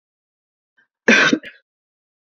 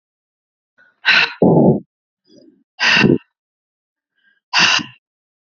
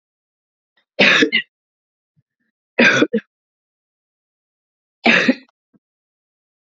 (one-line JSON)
{"cough_length": "2.3 s", "cough_amplitude": 28534, "cough_signal_mean_std_ratio": 0.28, "exhalation_length": "5.5 s", "exhalation_amplitude": 31687, "exhalation_signal_mean_std_ratio": 0.4, "three_cough_length": "6.7 s", "three_cough_amplitude": 31635, "three_cough_signal_mean_std_ratio": 0.3, "survey_phase": "beta (2021-08-13 to 2022-03-07)", "age": "18-44", "gender": "Female", "wearing_mask": "No", "symptom_cough_any": true, "symptom_new_continuous_cough": true, "symptom_shortness_of_breath": true, "symptom_sore_throat": true, "symptom_other": true, "symptom_onset": "3 days", "smoker_status": "Ex-smoker", "respiratory_condition_asthma": false, "respiratory_condition_other": false, "recruitment_source": "Test and Trace", "submission_delay": "1 day", "covid_test_result": "Positive", "covid_test_method": "RT-qPCR", "covid_ct_value": 28.5, "covid_ct_gene": "N gene"}